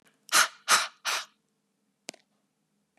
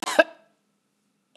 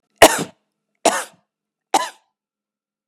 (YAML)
exhalation_length: 3.0 s
exhalation_amplitude: 14600
exhalation_signal_mean_std_ratio: 0.3
cough_length: 1.4 s
cough_amplitude: 32193
cough_signal_mean_std_ratio: 0.21
three_cough_length: 3.1 s
three_cough_amplitude: 32768
three_cough_signal_mean_std_ratio: 0.25
survey_phase: beta (2021-08-13 to 2022-03-07)
age: 45-64
gender: Female
wearing_mask: 'No'
symptom_runny_or_blocked_nose: true
symptom_fatigue: true
smoker_status: Never smoked
respiratory_condition_asthma: false
respiratory_condition_other: false
recruitment_source: REACT
submission_delay: 7 days
covid_test_result: Negative
covid_test_method: RT-qPCR